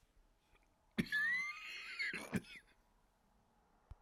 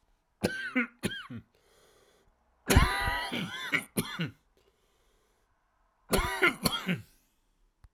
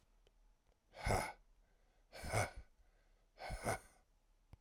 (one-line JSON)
{"cough_length": "4.0 s", "cough_amplitude": 2240, "cough_signal_mean_std_ratio": 0.47, "three_cough_length": "7.9 s", "three_cough_amplitude": 14467, "three_cough_signal_mean_std_ratio": 0.41, "exhalation_length": "4.6 s", "exhalation_amplitude": 2325, "exhalation_signal_mean_std_ratio": 0.38, "survey_phase": "alpha (2021-03-01 to 2021-08-12)", "age": "45-64", "gender": "Male", "wearing_mask": "No", "symptom_cough_any": true, "symptom_fatigue": true, "symptom_fever_high_temperature": true, "symptom_headache": true, "symptom_change_to_sense_of_smell_or_taste": true, "symptom_loss_of_taste": true, "symptom_onset": "3 days", "smoker_status": "Ex-smoker", "respiratory_condition_asthma": false, "respiratory_condition_other": false, "recruitment_source": "Test and Trace", "submission_delay": "2 days", "covid_test_result": "Positive", "covid_test_method": "RT-qPCR", "covid_ct_value": 16.5, "covid_ct_gene": "ORF1ab gene", "covid_ct_mean": 16.9, "covid_viral_load": "2800000 copies/ml", "covid_viral_load_category": "High viral load (>1M copies/ml)"}